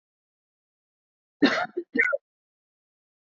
{
  "cough_length": "3.3 s",
  "cough_amplitude": 17873,
  "cough_signal_mean_std_ratio": 0.28,
  "survey_phase": "beta (2021-08-13 to 2022-03-07)",
  "age": "18-44",
  "gender": "Female",
  "wearing_mask": "No",
  "symptom_cough_any": true,
  "symptom_runny_or_blocked_nose": true,
  "symptom_sore_throat": true,
  "smoker_status": "Ex-smoker",
  "respiratory_condition_asthma": true,
  "respiratory_condition_other": false,
  "recruitment_source": "REACT",
  "submission_delay": "6 days",
  "covid_test_result": "Negative",
  "covid_test_method": "RT-qPCR",
  "influenza_a_test_result": "Negative",
  "influenza_b_test_result": "Negative"
}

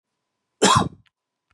{
  "cough_length": "1.5 s",
  "cough_amplitude": 21781,
  "cough_signal_mean_std_ratio": 0.32,
  "survey_phase": "beta (2021-08-13 to 2022-03-07)",
  "age": "45-64",
  "gender": "Male",
  "wearing_mask": "No",
  "symptom_cough_any": true,
  "symptom_new_continuous_cough": true,
  "symptom_runny_or_blocked_nose": true,
  "symptom_shortness_of_breath": true,
  "symptom_fever_high_temperature": true,
  "symptom_headache": true,
  "symptom_change_to_sense_of_smell_or_taste": true,
  "smoker_status": "Never smoked",
  "respiratory_condition_asthma": false,
  "respiratory_condition_other": false,
  "recruitment_source": "Test and Trace",
  "submission_delay": "2 days",
  "covid_test_result": "Positive",
  "covid_test_method": "RT-qPCR"
}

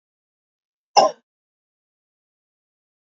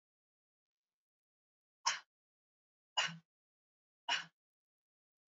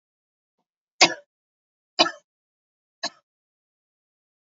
{
  "cough_length": "3.2 s",
  "cough_amplitude": 28529,
  "cough_signal_mean_std_ratio": 0.15,
  "exhalation_length": "5.3 s",
  "exhalation_amplitude": 4580,
  "exhalation_signal_mean_std_ratio": 0.21,
  "three_cough_length": "4.5 s",
  "three_cough_amplitude": 29398,
  "three_cough_signal_mean_std_ratio": 0.15,
  "survey_phase": "alpha (2021-03-01 to 2021-08-12)",
  "age": "45-64",
  "gender": "Female",
  "wearing_mask": "Yes",
  "symptom_none": true,
  "smoker_status": "Never smoked",
  "respiratory_condition_asthma": false,
  "respiratory_condition_other": false,
  "recruitment_source": "Test and Trace",
  "submission_delay": "2 days",
  "covid_test_result": "Positive",
  "covid_test_method": "RT-qPCR",
  "covid_ct_value": 15.6,
  "covid_ct_gene": "ORF1ab gene",
  "covid_ct_mean": 15.8,
  "covid_viral_load": "6700000 copies/ml",
  "covid_viral_load_category": "High viral load (>1M copies/ml)"
}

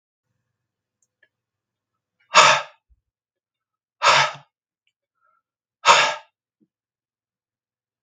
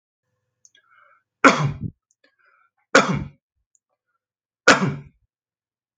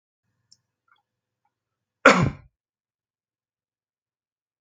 {
  "exhalation_length": "8.0 s",
  "exhalation_amplitude": 32767,
  "exhalation_signal_mean_std_ratio": 0.24,
  "three_cough_length": "6.0 s",
  "three_cough_amplitude": 32768,
  "three_cough_signal_mean_std_ratio": 0.26,
  "cough_length": "4.6 s",
  "cough_amplitude": 32767,
  "cough_signal_mean_std_ratio": 0.16,
  "survey_phase": "beta (2021-08-13 to 2022-03-07)",
  "age": "45-64",
  "gender": "Male",
  "wearing_mask": "No",
  "symptom_runny_or_blocked_nose": true,
  "smoker_status": "Never smoked",
  "respiratory_condition_asthma": false,
  "respiratory_condition_other": false,
  "recruitment_source": "Test and Trace",
  "submission_delay": "1 day",
  "covid_test_result": "Negative",
  "covid_test_method": "ePCR"
}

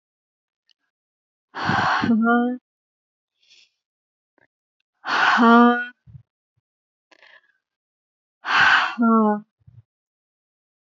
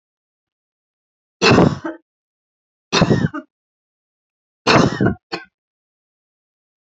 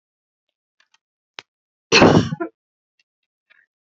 {
  "exhalation_length": "10.9 s",
  "exhalation_amplitude": 23561,
  "exhalation_signal_mean_std_ratio": 0.4,
  "three_cough_length": "6.9 s",
  "three_cough_amplitude": 29176,
  "three_cough_signal_mean_std_ratio": 0.32,
  "cough_length": "3.9 s",
  "cough_amplitude": 29153,
  "cough_signal_mean_std_ratio": 0.25,
  "survey_phase": "alpha (2021-03-01 to 2021-08-12)",
  "age": "45-64",
  "gender": "Female",
  "wearing_mask": "No",
  "symptom_none": true,
  "smoker_status": "Ex-smoker",
  "respiratory_condition_asthma": false,
  "respiratory_condition_other": false,
  "recruitment_source": "REACT",
  "submission_delay": "2 days",
  "covid_test_result": "Negative",
  "covid_test_method": "RT-qPCR"
}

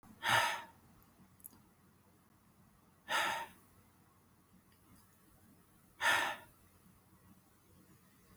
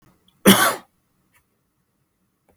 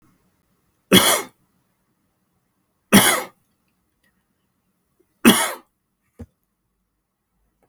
{
  "exhalation_length": "8.4 s",
  "exhalation_amplitude": 3798,
  "exhalation_signal_mean_std_ratio": 0.33,
  "cough_length": "2.6 s",
  "cough_amplitude": 32767,
  "cough_signal_mean_std_ratio": 0.25,
  "three_cough_length": "7.7 s",
  "three_cough_amplitude": 32768,
  "three_cough_signal_mean_std_ratio": 0.24,
  "survey_phase": "beta (2021-08-13 to 2022-03-07)",
  "age": "45-64",
  "gender": "Male",
  "wearing_mask": "No",
  "symptom_none": true,
  "smoker_status": "Never smoked",
  "respiratory_condition_asthma": false,
  "respiratory_condition_other": false,
  "recruitment_source": "REACT",
  "submission_delay": "1 day",
  "covid_test_result": "Negative",
  "covid_test_method": "RT-qPCR"
}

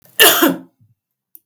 {
  "cough_length": "1.5 s",
  "cough_amplitude": 32768,
  "cough_signal_mean_std_ratio": 0.4,
  "survey_phase": "beta (2021-08-13 to 2022-03-07)",
  "age": "45-64",
  "gender": "Female",
  "wearing_mask": "No",
  "symptom_none": true,
  "symptom_onset": "4 days",
  "smoker_status": "Never smoked",
  "respiratory_condition_asthma": false,
  "respiratory_condition_other": false,
  "recruitment_source": "REACT",
  "submission_delay": "2 days",
  "covid_test_result": "Negative",
  "covid_test_method": "RT-qPCR"
}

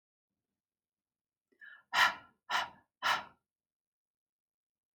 {
  "exhalation_length": "4.9 s",
  "exhalation_amplitude": 6770,
  "exhalation_signal_mean_std_ratio": 0.26,
  "survey_phase": "alpha (2021-03-01 to 2021-08-12)",
  "age": "18-44",
  "gender": "Female",
  "wearing_mask": "No",
  "symptom_headache": true,
  "symptom_onset": "12 days",
  "smoker_status": "Ex-smoker",
  "respiratory_condition_asthma": false,
  "respiratory_condition_other": false,
  "recruitment_source": "REACT",
  "submission_delay": "1 day",
  "covid_test_result": "Negative",
  "covid_test_method": "RT-qPCR"
}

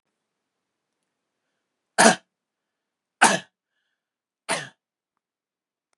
{
  "three_cough_length": "6.0 s",
  "three_cough_amplitude": 32144,
  "three_cough_signal_mean_std_ratio": 0.19,
  "survey_phase": "beta (2021-08-13 to 2022-03-07)",
  "age": "45-64",
  "gender": "Male",
  "wearing_mask": "No",
  "symptom_none": true,
  "smoker_status": "Ex-smoker",
  "respiratory_condition_asthma": false,
  "respiratory_condition_other": false,
  "recruitment_source": "REACT",
  "submission_delay": "3 days",
  "covid_test_result": "Negative",
  "covid_test_method": "RT-qPCR",
  "influenza_a_test_result": "Negative",
  "influenza_b_test_result": "Negative"
}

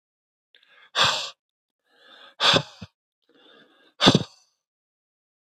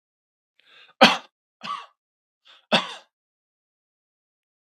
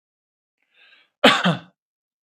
{
  "exhalation_length": "5.5 s",
  "exhalation_amplitude": 32766,
  "exhalation_signal_mean_std_ratio": 0.27,
  "three_cough_length": "4.6 s",
  "three_cough_amplitude": 32768,
  "three_cough_signal_mean_std_ratio": 0.19,
  "cough_length": "2.4 s",
  "cough_amplitude": 32766,
  "cough_signal_mean_std_ratio": 0.26,
  "survey_phase": "beta (2021-08-13 to 2022-03-07)",
  "age": "18-44",
  "gender": "Male",
  "wearing_mask": "No",
  "symptom_none": true,
  "smoker_status": "Never smoked",
  "respiratory_condition_asthma": false,
  "respiratory_condition_other": false,
  "recruitment_source": "REACT",
  "submission_delay": "1 day",
  "covid_test_result": "Negative",
  "covid_test_method": "RT-qPCR",
  "influenza_a_test_result": "Negative",
  "influenza_b_test_result": "Negative"
}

